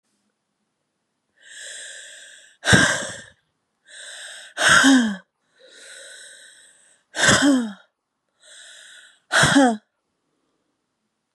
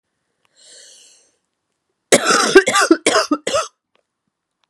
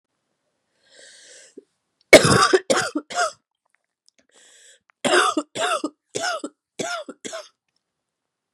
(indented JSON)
{
  "exhalation_length": "11.3 s",
  "exhalation_amplitude": 31467,
  "exhalation_signal_mean_std_ratio": 0.36,
  "cough_length": "4.7 s",
  "cough_amplitude": 32768,
  "cough_signal_mean_std_ratio": 0.37,
  "three_cough_length": "8.5 s",
  "three_cough_amplitude": 32768,
  "three_cough_signal_mean_std_ratio": 0.32,
  "survey_phase": "beta (2021-08-13 to 2022-03-07)",
  "age": "18-44",
  "gender": "Female",
  "wearing_mask": "No",
  "symptom_cough_any": true,
  "symptom_runny_or_blocked_nose": true,
  "symptom_shortness_of_breath": true,
  "symptom_sore_throat": true,
  "symptom_diarrhoea": true,
  "symptom_fatigue": true,
  "symptom_headache": true,
  "symptom_change_to_sense_of_smell_or_taste": true,
  "symptom_onset": "3 days",
  "smoker_status": "Never smoked",
  "respiratory_condition_asthma": false,
  "respiratory_condition_other": false,
  "recruitment_source": "Test and Trace",
  "submission_delay": "2 days",
  "covid_test_result": "Positive",
  "covid_test_method": "RT-qPCR",
  "covid_ct_value": 15.2,
  "covid_ct_gene": "ORF1ab gene",
  "covid_ct_mean": 15.7,
  "covid_viral_load": "7200000 copies/ml",
  "covid_viral_load_category": "High viral load (>1M copies/ml)"
}